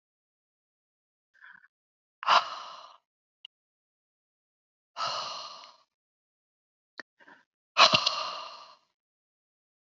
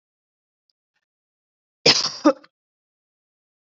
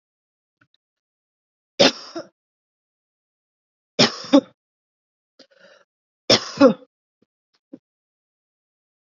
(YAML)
exhalation_length: 9.8 s
exhalation_amplitude: 19588
exhalation_signal_mean_std_ratio: 0.23
cough_length: 3.8 s
cough_amplitude: 28482
cough_signal_mean_std_ratio: 0.21
three_cough_length: 9.1 s
three_cough_amplitude: 31736
three_cough_signal_mean_std_ratio: 0.2
survey_phase: beta (2021-08-13 to 2022-03-07)
age: 45-64
gender: Female
wearing_mask: 'No'
symptom_none: true
smoker_status: Never smoked
respiratory_condition_asthma: false
respiratory_condition_other: false
recruitment_source: REACT
submission_delay: 2 days
covid_test_result: Negative
covid_test_method: RT-qPCR